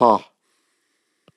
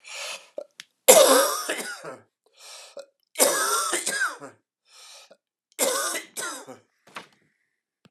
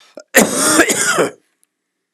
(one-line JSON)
{"exhalation_length": "1.4 s", "exhalation_amplitude": 31562, "exhalation_signal_mean_std_ratio": 0.25, "three_cough_length": "8.1 s", "three_cough_amplitude": 32767, "three_cough_signal_mean_std_ratio": 0.39, "cough_length": "2.1 s", "cough_amplitude": 32768, "cough_signal_mean_std_ratio": 0.54, "survey_phase": "beta (2021-08-13 to 2022-03-07)", "age": "45-64", "gender": "Male", "wearing_mask": "No", "symptom_cough_any": true, "symptom_new_continuous_cough": true, "symptom_runny_or_blocked_nose": true, "symptom_fatigue": true, "symptom_fever_high_temperature": true, "symptom_headache": true, "symptom_change_to_sense_of_smell_or_taste": true, "symptom_onset": "4 days", "smoker_status": "Ex-smoker", "respiratory_condition_asthma": false, "respiratory_condition_other": false, "recruitment_source": "Test and Trace", "submission_delay": "1 day", "covid_test_result": "Positive", "covid_test_method": "RT-qPCR", "covid_ct_value": 25.4, "covid_ct_gene": "ORF1ab gene"}